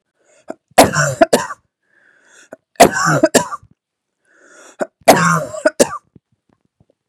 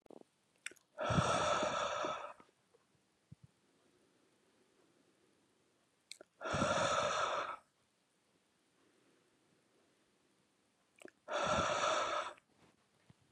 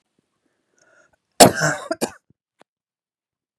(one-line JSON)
{"three_cough_length": "7.1 s", "three_cough_amplitude": 32768, "three_cough_signal_mean_std_ratio": 0.36, "exhalation_length": "13.3 s", "exhalation_amplitude": 3311, "exhalation_signal_mean_std_ratio": 0.44, "cough_length": "3.6 s", "cough_amplitude": 32768, "cough_signal_mean_std_ratio": 0.21, "survey_phase": "beta (2021-08-13 to 2022-03-07)", "age": "18-44", "gender": "Female", "wearing_mask": "No", "symptom_headache": true, "symptom_onset": "3 days", "smoker_status": "Never smoked", "respiratory_condition_asthma": false, "respiratory_condition_other": false, "recruitment_source": "Test and Trace", "submission_delay": "1 day", "covid_test_result": "Positive", "covid_test_method": "RT-qPCR"}